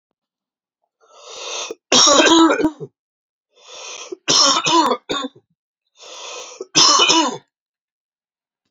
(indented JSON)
{
  "three_cough_length": "8.7 s",
  "three_cough_amplitude": 32768,
  "three_cough_signal_mean_std_ratio": 0.45,
  "survey_phase": "beta (2021-08-13 to 2022-03-07)",
  "age": "18-44",
  "gender": "Male",
  "wearing_mask": "No",
  "symptom_sore_throat": true,
  "symptom_abdominal_pain": true,
  "symptom_headache": true,
  "symptom_onset": "3 days",
  "smoker_status": "Ex-smoker",
  "respiratory_condition_asthma": false,
  "respiratory_condition_other": false,
  "recruitment_source": "Test and Trace",
  "submission_delay": "2 days",
  "covid_test_result": "Positive",
  "covid_test_method": "RT-qPCR",
  "covid_ct_value": 18.2,
  "covid_ct_gene": "N gene"
}